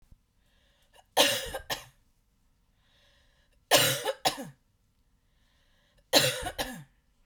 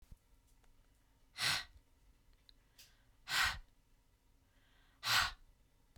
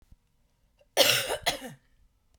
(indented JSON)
{
  "three_cough_length": "7.3 s",
  "three_cough_amplitude": 16853,
  "three_cough_signal_mean_std_ratio": 0.33,
  "exhalation_length": "6.0 s",
  "exhalation_amplitude": 3386,
  "exhalation_signal_mean_std_ratio": 0.33,
  "cough_length": "2.4 s",
  "cough_amplitude": 17833,
  "cough_signal_mean_std_ratio": 0.36,
  "survey_phase": "beta (2021-08-13 to 2022-03-07)",
  "age": "45-64",
  "gender": "Female",
  "wearing_mask": "No",
  "symptom_none": true,
  "smoker_status": "Never smoked",
  "respiratory_condition_asthma": false,
  "respiratory_condition_other": false,
  "recruitment_source": "REACT",
  "submission_delay": "10 days",
  "covid_test_result": "Negative",
  "covid_test_method": "RT-qPCR",
  "influenza_a_test_result": "Negative",
  "influenza_b_test_result": "Negative"
}